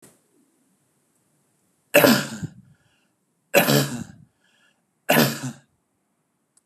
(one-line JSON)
{"three_cough_length": "6.7 s", "three_cough_amplitude": 28716, "three_cough_signal_mean_std_ratio": 0.31, "survey_phase": "beta (2021-08-13 to 2022-03-07)", "age": "45-64", "gender": "Male", "wearing_mask": "No", "symptom_none": true, "smoker_status": "Never smoked", "respiratory_condition_asthma": false, "respiratory_condition_other": false, "recruitment_source": "REACT", "submission_delay": "1 day", "covid_test_result": "Negative", "covid_test_method": "RT-qPCR", "covid_ct_value": 37.6, "covid_ct_gene": "N gene", "influenza_a_test_result": "Negative", "influenza_b_test_result": "Negative"}